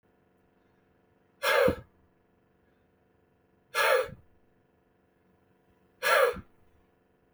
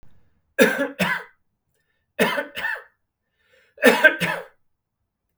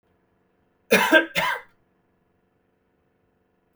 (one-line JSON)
{"exhalation_length": "7.3 s", "exhalation_amplitude": 9971, "exhalation_signal_mean_std_ratio": 0.31, "three_cough_length": "5.4 s", "three_cough_amplitude": 32768, "three_cough_signal_mean_std_ratio": 0.36, "cough_length": "3.8 s", "cough_amplitude": 27595, "cough_signal_mean_std_ratio": 0.28, "survey_phase": "beta (2021-08-13 to 2022-03-07)", "age": "45-64", "gender": "Male", "wearing_mask": "No", "symptom_none": true, "smoker_status": "Never smoked", "respiratory_condition_asthma": false, "respiratory_condition_other": false, "recruitment_source": "REACT", "submission_delay": "2 days", "covid_test_result": "Negative", "covid_test_method": "RT-qPCR", "influenza_a_test_result": "Negative", "influenza_b_test_result": "Negative"}